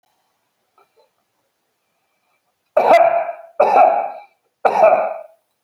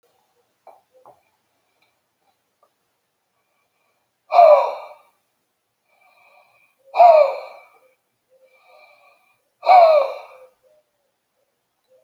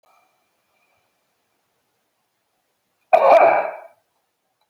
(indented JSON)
{
  "three_cough_length": "5.6 s",
  "three_cough_amplitude": 30771,
  "three_cough_signal_mean_std_ratio": 0.42,
  "exhalation_length": "12.0 s",
  "exhalation_amplitude": 29697,
  "exhalation_signal_mean_std_ratio": 0.26,
  "cough_length": "4.7 s",
  "cough_amplitude": 28316,
  "cough_signal_mean_std_ratio": 0.27,
  "survey_phase": "beta (2021-08-13 to 2022-03-07)",
  "age": "65+",
  "gender": "Male",
  "wearing_mask": "No",
  "symptom_none": true,
  "smoker_status": "Never smoked",
  "respiratory_condition_asthma": true,
  "respiratory_condition_other": false,
  "recruitment_source": "REACT",
  "submission_delay": "1 day",
  "covid_test_result": "Negative",
  "covid_test_method": "RT-qPCR"
}